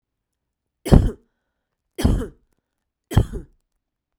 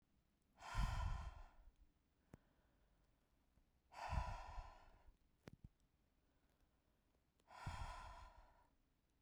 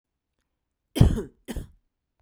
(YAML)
three_cough_length: 4.2 s
three_cough_amplitude: 32768
three_cough_signal_mean_std_ratio: 0.27
exhalation_length: 9.2 s
exhalation_amplitude: 938
exhalation_signal_mean_std_ratio: 0.4
cough_length: 2.2 s
cough_amplitude: 27774
cough_signal_mean_std_ratio: 0.26
survey_phase: beta (2021-08-13 to 2022-03-07)
age: 45-64
gender: Female
wearing_mask: 'No'
symptom_none: true
smoker_status: Current smoker (1 to 10 cigarettes per day)
respiratory_condition_asthma: false
respiratory_condition_other: false
recruitment_source: REACT
submission_delay: 8 days
covid_test_result: Negative
covid_test_method: RT-qPCR